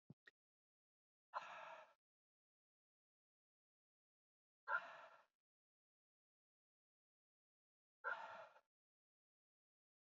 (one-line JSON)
{"exhalation_length": "10.2 s", "exhalation_amplitude": 890, "exhalation_signal_mean_std_ratio": 0.23, "survey_phase": "beta (2021-08-13 to 2022-03-07)", "age": "18-44", "gender": "Male", "wearing_mask": "No", "symptom_cough_any": true, "symptom_runny_or_blocked_nose": true, "symptom_sore_throat": true, "symptom_fatigue": true, "symptom_fever_high_temperature": true, "symptom_headache": true, "smoker_status": "Never smoked", "respiratory_condition_asthma": false, "respiratory_condition_other": false, "recruitment_source": "Test and Trace", "submission_delay": "1 day", "covid_test_result": "Positive", "covid_test_method": "LFT"}